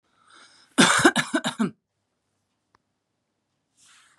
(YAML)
cough_length: 4.2 s
cough_amplitude: 26074
cough_signal_mean_std_ratio: 0.3
survey_phase: beta (2021-08-13 to 2022-03-07)
age: 18-44
gender: Female
wearing_mask: 'No'
symptom_none: true
smoker_status: Current smoker (11 or more cigarettes per day)
respiratory_condition_asthma: false
respiratory_condition_other: false
recruitment_source: REACT
submission_delay: 0 days
covid_test_result: Negative
covid_test_method: RT-qPCR
influenza_a_test_result: Negative
influenza_b_test_result: Negative